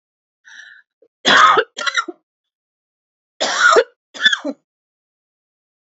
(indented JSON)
{
  "cough_length": "5.8 s",
  "cough_amplitude": 29775,
  "cough_signal_mean_std_ratio": 0.36,
  "survey_phase": "alpha (2021-03-01 to 2021-08-12)",
  "age": "45-64",
  "gender": "Female",
  "wearing_mask": "No",
  "symptom_cough_any": true,
  "symptom_shortness_of_breath": true,
  "symptom_fatigue": true,
  "symptom_onset": "4 days",
  "smoker_status": "Never smoked",
  "respiratory_condition_asthma": false,
  "respiratory_condition_other": false,
  "recruitment_source": "Test and Trace",
  "submission_delay": "2 days",
  "covid_test_result": "Positive",
  "covid_test_method": "RT-qPCR",
  "covid_ct_value": 30.3,
  "covid_ct_gene": "N gene",
  "covid_ct_mean": 30.9,
  "covid_viral_load": "72 copies/ml",
  "covid_viral_load_category": "Minimal viral load (< 10K copies/ml)"
}